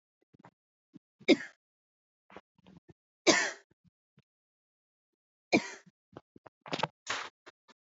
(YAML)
three_cough_length: 7.9 s
three_cough_amplitude: 14682
three_cough_signal_mean_std_ratio: 0.21
survey_phase: beta (2021-08-13 to 2022-03-07)
age: 18-44
gender: Female
wearing_mask: 'No'
symptom_none: true
smoker_status: Never smoked
respiratory_condition_asthma: true
respiratory_condition_other: false
recruitment_source: REACT
submission_delay: 1 day
covid_test_result: Negative
covid_test_method: RT-qPCR